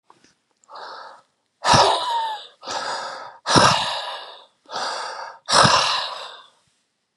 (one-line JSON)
{"exhalation_length": "7.2 s", "exhalation_amplitude": 32768, "exhalation_signal_mean_std_ratio": 0.49, "survey_phase": "beta (2021-08-13 to 2022-03-07)", "age": "45-64", "gender": "Male", "wearing_mask": "No", "symptom_diarrhoea": true, "symptom_onset": "12 days", "smoker_status": "Prefer not to say", "respiratory_condition_asthma": false, "respiratory_condition_other": false, "recruitment_source": "REACT", "submission_delay": "1 day", "covid_test_result": "Negative", "covid_test_method": "RT-qPCR"}